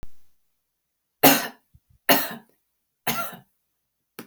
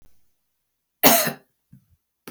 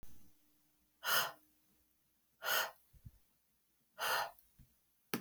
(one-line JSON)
{"three_cough_length": "4.3 s", "three_cough_amplitude": 32767, "three_cough_signal_mean_std_ratio": 0.29, "cough_length": "2.3 s", "cough_amplitude": 32768, "cough_signal_mean_std_ratio": 0.27, "exhalation_length": "5.2 s", "exhalation_amplitude": 5678, "exhalation_signal_mean_std_ratio": 0.37, "survey_phase": "alpha (2021-03-01 to 2021-08-12)", "age": "45-64", "gender": "Female", "wearing_mask": "No", "symptom_none": true, "symptom_onset": "12 days", "smoker_status": "Never smoked", "respiratory_condition_asthma": false, "respiratory_condition_other": false, "recruitment_source": "REACT", "submission_delay": "1 day", "covid_test_result": "Negative", "covid_test_method": "RT-qPCR"}